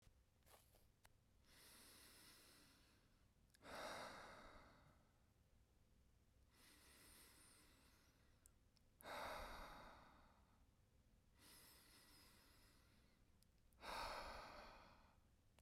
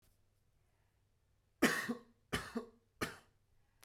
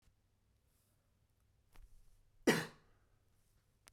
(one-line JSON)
{"exhalation_length": "15.6 s", "exhalation_amplitude": 392, "exhalation_signal_mean_std_ratio": 0.57, "three_cough_length": "3.8 s", "three_cough_amplitude": 4736, "three_cough_signal_mean_std_ratio": 0.3, "cough_length": "3.9 s", "cough_amplitude": 4362, "cough_signal_mean_std_ratio": 0.19, "survey_phase": "beta (2021-08-13 to 2022-03-07)", "age": "18-44", "gender": "Male", "wearing_mask": "No", "symptom_none": true, "smoker_status": "Never smoked", "respiratory_condition_asthma": false, "respiratory_condition_other": false, "recruitment_source": "REACT", "submission_delay": "2 days", "covid_test_result": "Negative", "covid_test_method": "RT-qPCR", "influenza_a_test_result": "Negative", "influenza_b_test_result": "Negative"}